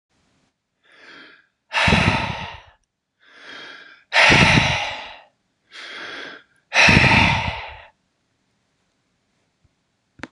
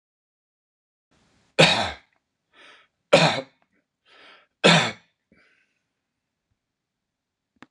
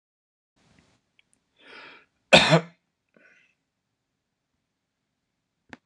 {"exhalation_length": "10.3 s", "exhalation_amplitude": 26028, "exhalation_signal_mean_std_ratio": 0.4, "three_cough_length": "7.7 s", "three_cough_amplitude": 25791, "three_cough_signal_mean_std_ratio": 0.24, "cough_length": "5.9 s", "cough_amplitude": 26027, "cough_signal_mean_std_ratio": 0.17, "survey_phase": "beta (2021-08-13 to 2022-03-07)", "age": "45-64", "gender": "Male", "wearing_mask": "No", "symptom_none": true, "smoker_status": "Never smoked", "respiratory_condition_asthma": false, "respiratory_condition_other": false, "recruitment_source": "REACT", "submission_delay": "0 days", "covid_test_result": "Negative", "covid_test_method": "RT-qPCR", "influenza_a_test_result": "Negative", "influenza_b_test_result": "Negative"}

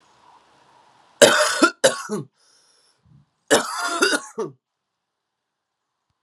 {"three_cough_length": "6.2 s", "three_cough_amplitude": 32768, "three_cough_signal_mean_std_ratio": 0.34, "survey_phase": "alpha (2021-03-01 to 2021-08-12)", "age": "18-44", "gender": "Male", "wearing_mask": "No", "symptom_cough_any": true, "symptom_fatigue": true, "symptom_headache": true, "symptom_onset": "4 days", "smoker_status": "Never smoked", "respiratory_condition_asthma": false, "respiratory_condition_other": false, "recruitment_source": "Test and Trace", "submission_delay": "2 days", "covid_test_result": "Positive", "covid_test_method": "RT-qPCR"}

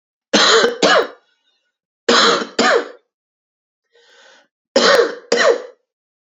{"three_cough_length": "6.4 s", "three_cough_amplitude": 32767, "three_cough_signal_mean_std_ratio": 0.47, "survey_phase": "beta (2021-08-13 to 2022-03-07)", "age": "18-44", "gender": "Male", "wearing_mask": "No", "symptom_cough_any": true, "symptom_runny_or_blocked_nose": true, "symptom_fatigue": true, "symptom_headache": true, "smoker_status": "Never smoked", "respiratory_condition_asthma": false, "respiratory_condition_other": false, "recruitment_source": "Test and Trace", "submission_delay": "2 days", "covid_test_result": "Positive", "covid_test_method": "RT-qPCR"}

